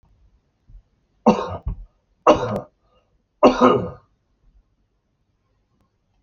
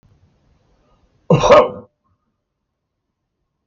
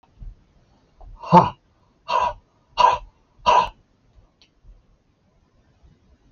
{
  "three_cough_length": "6.2 s",
  "three_cough_amplitude": 28840,
  "three_cough_signal_mean_std_ratio": 0.29,
  "cough_length": "3.7 s",
  "cough_amplitude": 27897,
  "cough_signal_mean_std_ratio": 0.26,
  "exhalation_length": "6.3 s",
  "exhalation_amplitude": 27736,
  "exhalation_signal_mean_std_ratio": 0.29,
  "survey_phase": "alpha (2021-03-01 to 2021-08-12)",
  "age": "65+",
  "gender": "Male",
  "wearing_mask": "No",
  "symptom_none": true,
  "smoker_status": "Current smoker (e-cigarettes or vapes only)",
  "respiratory_condition_asthma": false,
  "respiratory_condition_other": false,
  "recruitment_source": "REACT",
  "submission_delay": "1 day",
  "covid_test_result": "Negative",
  "covid_test_method": "RT-qPCR"
}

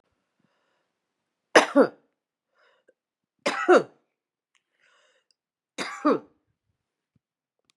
{
  "three_cough_length": "7.8 s",
  "three_cough_amplitude": 25461,
  "three_cough_signal_mean_std_ratio": 0.22,
  "survey_phase": "beta (2021-08-13 to 2022-03-07)",
  "age": "65+",
  "gender": "Female",
  "wearing_mask": "No",
  "symptom_runny_or_blocked_nose": true,
  "symptom_sore_throat": true,
  "smoker_status": "Ex-smoker",
  "respiratory_condition_asthma": true,
  "respiratory_condition_other": true,
  "recruitment_source": "Test and Trace",
  "submission_delay": "3 days",
  "covid_test_result": "Negative",
  "covid_test_method": "ePCR"
}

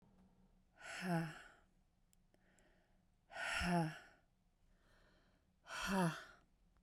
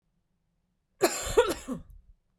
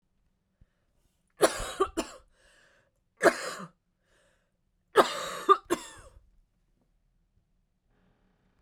{
  "exhalation_length": "6.8 s",
  "exhalation_amplitude": 1800,
  "exhalation_signal_mean_std_ratio": 0.4,
  "cough_length": "2.4 s",
  "cough_amplitude": 12656,
  "cough_signal_mean_std_ratio": 0.35,
  "three_cough_length": "8.6 s",
  "three_cough_amplitude": 17685,
  "three_cough_signal_mean_std_ratio": 0.24,
  "survey_phase": "beta (2021-08-13 to 2022-03-07)",
  "age": "45-64",
  "gender": "Female",
  "wearing_mask": "No",
  "symptom_cough_any": true,
  "symptom_diarrhoea": true,
  "symptom_fatigue": true,
  "symptom_headache": true,
  "symptom_onset": "4 days",
  "smoker_status": "Never smoked",
  "respiratory_condition_asthma": false,
  "respiratory_condition_other": false,
  "recruitment_source": "Test and Trace",
  "submission_delay": "2 days",
  "covid_test_result": "Positive",
  "covid_test_method": "RT-qPCR",
  "covid_ct_value": 26.9,
  "covid_ct_gene": "N gene"
}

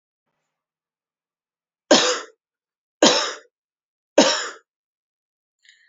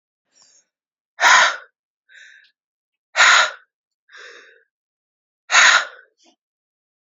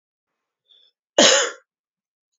{
  "three_cough_length": "5.9 s",
  "three_cough_amplitude": 29838,
  "three_cough_signal_mean_std_ratio": 0.27,
  "exhalation_length": "7.1 s",
  "exhalation_amplitude": 30331,
  "exhalation_signal_mean_std_ratio": 0.31,
  "cough_length": "2.4 s",
  "cough_amplitude": 32768,
  "cough_signal_mean_std_ratio": 0.28,
  "survey_phase": "beta (2021-08-13 to 2022-03-07)",
  "age": "18-44",
  "gender": "Female",
  "wearing_mask": "No",
  "symptom_cough_any": true,
  "symptom_runny_or_blocked_nose": true,
  "symptom_abdominal_pain": true,
  "symptom_fatigue": true,
  "symptom_headache": true,
  "symptom_change_to_sense_of_smell_or_taste": true,
  "symptom_loss_of_taste": true,
  "symptom_other": true,
  "smoker_status": "Never smoked",
  "respiratory_condition_asthma": false,
  "respiratory_condition_other": false,
  "recruitment_source": "Test and Trace",
  "submission_delay": "1 day",
  "covid_test_result": "Positive",
  "covid_test_method": "RT-qPCR"
}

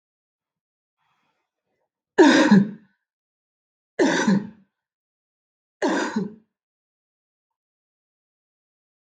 {
  "three_cough_length": "9.0 s",
  "three_cough_amplitude": 24665,
  "three_cough_signal_mean_std_ratio": 0.29,
  "survey_phase": "beta (2021-08-13 to 2022-03-07)",
  "age": "18-44",
  "gender": "Female",
  "wearing_mask": "No",
  "symptom_cough_any": true,
  "symptom_runny_or_blocked_nose": true,
  "symptom_onset": "12 days",
  "smoker_status": "Never smoked",
  "respiratory_condition_asthma": false,
  "respiratory_condition_other": false,
  "recruitment_source": "REACT",
  "submission_delay": "1 day",
  "covid_test_result": "Negative",
  "covid_test_method": "RT-qPCR",
  "influenza_a_test_result": "Negative",
  "influenza_b_test_result": "Negative"
}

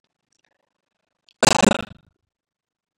{
  "cough_length": "3.0 s",
  "cough_amplitude": 31951,
  "cough_signal_mean_std_ratio": 0.21,
  "survey_phase": "beta (2021-08-13 to 2022-03-07)",
  "age": "45-64",
  "gender": "Male",
  "wearing_mask": "No",
  "symptom_none": true,
  "smoker_status": "Never smoked",
  "respiratory_condition_asthma": false,
  "respiratory_condition_other": false,
  "recruitment_source": "REACT",
  "submission_delay": "0 days",
  "covid_test_result": "Negative",
  "covid_test_method": "RT-qPCR",
  "influenza_a_test_result": "Negative",
  "influenza_b_test_result": "Negative"
}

